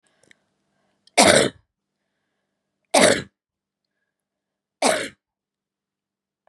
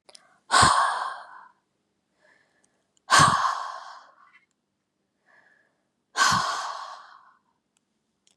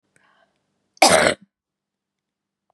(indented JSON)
{
  "three_cough_length": "6.5 s",
  "three_cough_amplitude": 32767,
  "three_cough_signal_mean_std_ratio": 0.26,
  "exhalation_length": "8.4 s",
  "exhalation_amplitude": 21040,
  "exhalation_signal_mean_std_ratio": 0.35,
  "cough_length": "2.7 s",
  "cough_amplitude": 32556,
  "cough_signal_mean_std_ratio": 0.26,
  "survey_phase": "beta (2021-08-13 to 2022-03-07)",
  "age": "45-64",
  "gender": "Female",
  "wearing_mask": "No",
  "symptom_none": true,
  "smoker_status": "Ex-smoker",
  "respiratory_condition_asthma": true,
  "respiratory_condition_other": true,
  "recruitment_source": "Test and Trace",
  "submission_delay": "1 day",
  "covid_test_result": "Negative",
  "covid_test_method": "LFT"
}